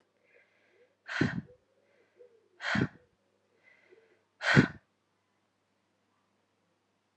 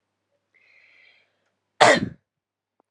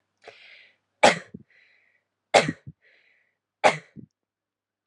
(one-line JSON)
{"exhalation_length": "7.2 s", "exhalation_amplitude": 14580, "exhalation_signal_mean_std_ratio": 0.23, "cough_length": "2.9 s", "cough_amplitude": 32767, "cough_signal_mean_std_ratio": 0.22, "three_cough_length": "4.9 s", "three_cough_amplitude": 30835, "three_cough_signal_mean_std_ratio": 0.21, "survey_phase": "alpha (2021-03-01 to 2021-08-12)", "age": "18-44", "gender": "Female", "wearing_mask": "No", "symptom_shortness_of_breath": true, "symptom_headache": true, "smoker_status": "Never smoked", "respiratory_condition_asthma": false, "respiratory_condition_other": false, "recruitment_source": "Test and Trace", "submission_delay": "1 day", "covid_test_result": "Positive", "covid_test_method": "RT-qPCR"}